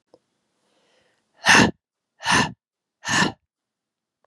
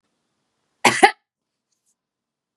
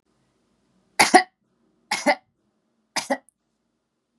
{"exhalation_length": "4.3 s", "exhalation_amplitude": 31438, "exhalation_signal_mean_std_ratio": 0.31, "cough_length": "2.6 s", "cough_amplitude": 32767, "cough_signal_mean_std_ratio": 0.2, "three_cough_length": "4.2 s", "three_cough_amplitude": 31235, "three_cough_signal_mean_std_ratio": 0.23, "survey_phase": "beta (2021-08-13 to 2022-03-07)", "age": "18-44", "gender": "Female", "wearing_mask": "No", "symptom_runny_or_blocked_nose": true, "symptom_fatigue": true, "smoker_status": "Never smoked", "respiratory_condition_asthma": false, "respiratory_condition_other": false, "recruitment_source": "Test and Trace", "submission_delay": "2 days", "covid_test_result": "Positive", "covid_test_method": "ePCR"}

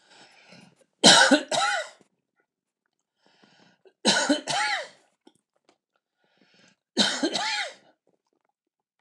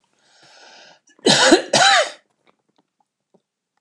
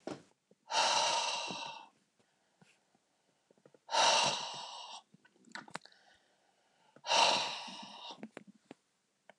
{"three_cough_length": "9.0 s", "three_cough_amplitude": 28903, "three_cough_signal_mean_std_ratio": 0.34, "cough_length": "3.8 s", "cough_amplitude": 29203, "cough_signal_mean_std_ratio": 0.36, "exhalation_length": "9.4 s", "exhalation_amplitude": 6187, "exhalation_signal_mean_std_ratio": 0.41, "survey_phase": "beta (2021-08-13 to 2022-03-07)", "age": "65+", "gender": "Male", "wearing_mask": "No", "symptom_none": true, "smoker_status": "Ex-smoker", "respiratory_condition_asthma": false, "respiratory_condition_other": false, "recruitment_source": "REACT", "submission_delay": "2 days", "covid_test_result": "Negative", "covid_test_method": "RT-qPCR", "influenza_a_test_result": "Negative", "influenza_b_test_result": "Negative"}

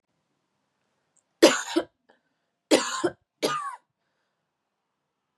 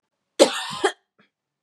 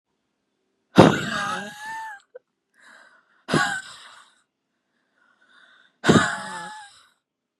{"three_cough_length": "5.4 s", "three_cough_amplitude": 28982, "three_cough_signal_mean_std_ratio": 0.27, "cough_length": "1.6 s", "cough_amplitude": 31614, "cough_signal_mean_std_ratio": 0.31, "exhalation_length": "7.6 s", "exhalation_amplitude": 32768, "exhalation_signal_mean_std_ratio": 0.29, "survey_phase": "beta (2021-08-13 to 2022-03-07)", "age": "18-44", "gender": "Female", "wearing_mask": "No", "symptom_none": true, "symptom_onset": "13 days", "smoker_status": "Never smoked", "respiratory_condition_asthma": false, "respiratory_condition_other": false, "recruitment_source": "REACT", "submission_delay": "1 day", "covid_test_result": "Negative", "covid_test_method": "RT-qPCR", "influenza_a_test_result": "Negative", "influenza_b_test_result": "Negative"}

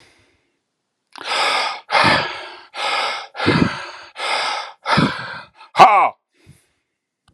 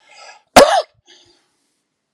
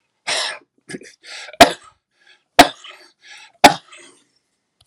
{"exhalation_length": "7.3 s", "exhalation_amplitude": 32768, "exhalation_signal_mean_std_ratio": 0.48, "cough_length": "2.1 s", "cough_amplitude": 32768, "cough_signal_mean_std_ratio": 0.27, "three_cough_length": "4.9 s", "three_cough_amplitude": 32768, "three_cough_signal_mean_std_ratio": 0.22, "survey_phase": "alpha (2021-03-01 to 2021-08-12)", "age": "45-64", "gender": "Male", "wearing_mask": "No", "symptom_none": true, "smoker_status": "Never smoked", "respiratory_condition_asthma": false, "respiratory_condition_other": false, "recruitment_source": "Test and Trace", "submission_delay": "0 days", "covid_test_result": "Negative", "covid_test_method": "RT-qPCR"}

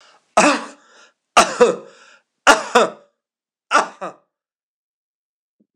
{"three_cough_length": "5.8 s", "three_cough_amplitude": 26028, "three_cough_signal_mean_std_ratio": 0.32, "survey_phase": "alpha (2021-03-01 to 2021-08-12)", "age": "65+", "gender": "Male", "wearing_mask": "No", "symptom_none": true, "smoker_status": "Never smoked", "respiratory_condition_asthma": false, "respiratory_condition_other": false, "recruitment_source": "REACT", "submission_delay": "1 day", "covid_test_result": "Negative", "covid_test_method": "RT-qPCR"}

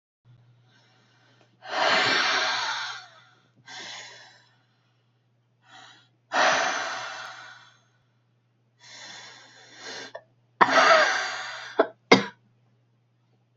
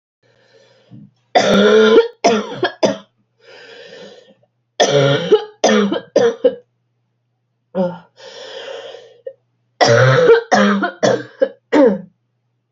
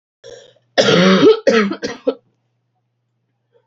{"exhalation_length": "13.6 s", "exhalation_amplitude": 28633, "exhalation_signal_mean_std_ratio": 0.38, "three_cough_length": "12.7 s", "three_cough_amplitude": 29891, "three_cough_signal_mean_std_ratio": 0.5, "cough_length": "3.7 s", "cough_amplitude": 32148, "cough_signal_mean_std_ratio": 0.44, "survey_phase": "beta (2021-08-13 to 2022-03-07)", "age": "18-44", "gender": "Female", "wearing_mask": "No", "symptom_cough_any": true, "symptom_runny_or_blocked_nose": true, "symptom_shortness_of_breath": true, "symptom_sore_throat": true, "symptom_diarrhoea": true, "symptom_fatigue": true, "symptom_fever_high_temperature": true, "symptom_headache": true, "symptom_change_to_sense_of_smell_or_taste": true, "smoker_status": "Never smoked", "respiratory_condition_asthma": false, "respiratory_condition_other": false, "recruitment_source": "Test and Trace", "submission_delay": "1 day", "covid_test_result": "Positive", "covid_test_method": "LFT"}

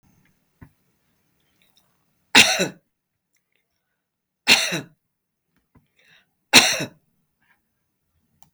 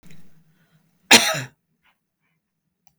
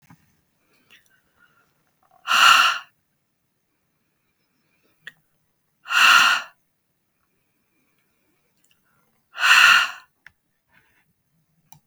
{"three_cough_length": "8.5 s", "three_cough_amplitude": 32766, "three_cough_signal_mean_std_ratio": 0.22, "cough_length": "3.0 s", "cough_amplitude": 32768, "cough_signal_mean_std_ratio": 0.22, "exhalation_length": "11.9 s", "exhalation_amplitude": 32506, "exhalation_signal_mean_std_ratio": 0.28, "survey_phase": "beta (2021-08-13 to 2022-03-07)", "age": "65+", "gender": "Female", "wearing_mask": "No", "symptom_none": true, "smoker_status": "Never smoked", "respiratory_condition_asthma": false, "respiratory_condition_other": false, "recruitment_source": "REACT", "submission_delay": "12 days", "covid_test_result": "Negative", "covid_test_method": "RT-qPCR"}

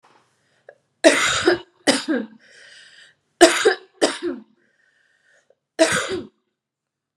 {"three_cough_length": "7.2 s", "three_cough_amplitude": 32767, "three_cough_signal_mean_std_ratio": 0.36, "survey_phase": "beta (2021-08-13 to 2022-03-07)", "age": "18-44", "gender": "Female", "wearing_mask": "No", "symptom_none": true, "smoker_status": "Current smoker (e-cigarettes or vapes only)", "respiratory_condition_asthma": false, "respiratory_condition_other": false, "recruitment_source": "REACT", "submission_delay": "4 days", "covid_test_result": "Negative", "covid_test_method": "RT-qPCR"}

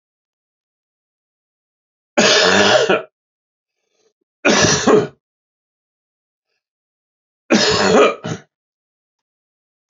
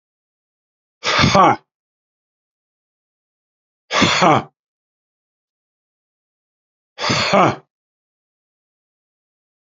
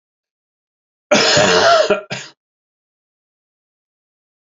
{"three_cough_length": "9.9 s", "three_cough_amplitude": 32767, "three_cough_signal_mean_std_ratio": 0.38, "exhalation_length": "9.6 s", "exhalation_amplitude": 32768, "exhalation_signal_mean_std_ratio": 0.3, "cough_length": "4.5 s", "cough_amplitude": 30530, "cough_signal_mean_std_ratio": 0.38, "survey_phase": "beta (2021-08-13 to 2022-03-07)", "age": "65+", "gender": "Male", "wearing_mask": "No", "symptom_cough_any": true, "symptom_runny_or_blocked_nose": true, "symptom_headache": true, "symptom_onset": "5 days", "smoker_status": "Ex-smoker", "respiratory_condition_asthma": false, "respiratory_condition_other": false, "recruitment_source": "Test and Trace", "submission_delay": "1 day", "covid_test_result": "Positive", "covid_test_method": "RT-qPCR", "covid_ct_value": 13.8, "covid_ct_gene": "ORF1ab gene", "covid_ct_mean": 14.0, "covid_viral_load": "25000000 copies/ml", "covid_viral_load_category": "High viral load (>1M copies/ml)"}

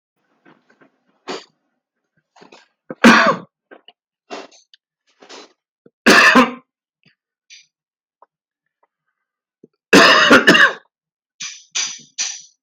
{"three_cough_length": "12.6 s", "three_cough_amplitude": 32768, "three_cough_signal_mean_std_ratio": 0.31, "survey_phase": "beta (2021-08-13 to 2022-03-07)", "age": "45-64", "gender": "Male", "wearing_mask": "No", "symptom_none": true, "smoker_status": "Ex-smoker", "respiratory_condition_asthma": false, "respiratory_condition_other": false, "recruitment_source": "REACT", "submission_delay": "4 days", "covid_test_result": "Negative", "covid_test_method": "RT-qPCR", "influenza_a_test_result": "Negative", "influenza_b_test_result": "Negative"}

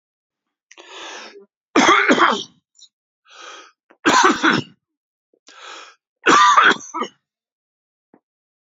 {"three_cough_length": "8.7 s", "three_cough_amplitude": 32767, "three_cough_signal_mean_std_ratio": 0.38, "survey_phase": "beta (2021-08-13 to 2022-03-07)", "age": "45-64", "gender": "Male", "wearing_mask": "No", "symptom_none": true, "smoker_status": "Current smoker (11 or more cigarettes per day)", "respiratory_condition_asthma": false, "respiratory_condition_other": false, "recruitment_source": "REACT", "submission_delay": "0 days", "covid_test_result": "Negative", "covid_test_method": "RT-qPCR"}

